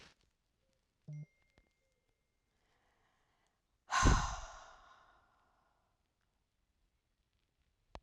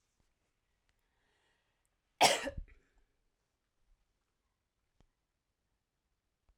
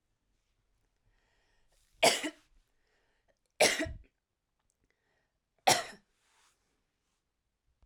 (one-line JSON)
{"exhalation_length": "8.0 s", "exhalation_amplitude": 5964, "exhalation_signal_mean_std_ratio": 0.21, "cough_length": "6.6 s", "cough_amplitude": 8003, "cough_signal_mean_std_ratio": 0.15, "three_cough_length": "7.9 s", "three_cough_amplitude": 9585, "three_cough_signal_mean_std_ratio": 0.21, "survey_phase": "alpha (2021-03-01 to 2021-08-12)", "age": "18-44", "gender": "Female", "wearing_mask": "No", "symptom_none": true, "smoker_status": "Ex-smoker", "respiratory_condition_asthma": false, "respiratory_condition_other": false, "recruitment_source": "REACT", "submission_delay": "1 day", "covid_test_result": "Negative", "covid_test_method": "RT-qPCR"}